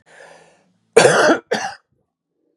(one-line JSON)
{"cough_length": "2.6 s", "cough_amplitude": 32768, "cough_signal_mean_std_ratio": 0.37, "survey_phase": "beta (2021-08-13 to 2022-03-07)", "age": "45-64", "gender": "Male", "wearing_mask": "No", "symptom_cough_any": true, "smoker_status": "Never smoked", "respiratory_condition_asthma": false, "respiratory_condition_other": false, "recruitment_source": "Test and Trace", "submission_delay": "1 day", "covid_test_result": "Negative", "covid_test_method": "RT-qPCR"}